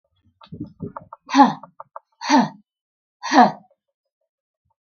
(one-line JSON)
{"exhalation_length": "4.9 s", "exhalation_amplitude": 32766, "exhalation_signal_mean_std_ratio": 0.3, "survey_phase": "beta (2021-08-13 to 2022-03-07)", "age": "65+", "gender": "Female", "wearing_mask": "No", "symptom_none": true, "smoker_status": "Never smoked", "respiratory_condition_asthma": false, "respiratory_condition_other": false, "recruitment_source": "REACT", "submission_delay": "3 days", "covid_test_result": "Negative", "covid_test_method": "RT-qPCR"}